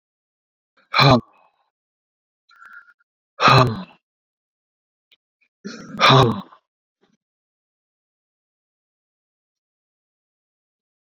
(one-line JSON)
{"exhalation_length": "11.0 s", "exhalation_amplitude": 32768, "exhalation_signal_mean_std_ratio": 0.24, "survey_phase": "beta (2021-08-13 to 2022-03-07)", "age": "45-64", "gender": "Male", "wearing_mask": "No", "symptom_runny_or_blocked_nose": true, "symptom_fatigue": true, "symptom_fever_high_temperature": true, "symptom_headache": true, "symptom_onset": "2 days", "smoker_status": "Never smoked", "respiratory_condition_asthma": true, "respiratory_condition_other": false, "recruitment_source": "Test and Trace", "submission_delay": "2 days", "covid_test_result": "Positive", "covid_test_method": "RT-qPCR", "covid_ct_value": 27.5, "covid_ct_gene": "ORF1ab gene", "covid_ct_mean": 28.1, "covid_viral_load": "580 copies/ml", "covid_viral_load_category": "Minimal viral load (< 10K copies/ml)"}